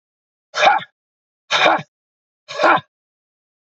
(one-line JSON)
{"exhalation_length": "3.8 s", "exhalation_amplitude": 29617, "exhalation_signal_mean_std_ratio": 0.36, "survey_phase": "beta (2021-08-13 to 2022-03-07)", "age": "45-64", "gender": "Male", "wearing_mask": "No", "symptom_none": true, "symptom_onset": "12 days", "smoker_status": "Never smoked", "respiratory_condition_asthma": false, "respiratory_condition_other": false, "recruitment_source": "REACT", "submission_delay": "1 day", "covid_test_result": "Negative", "covid_test_method": "RT-qPCR", "influenza_a_test_result": "Negative", "influenza_b_test_result": "Negative"}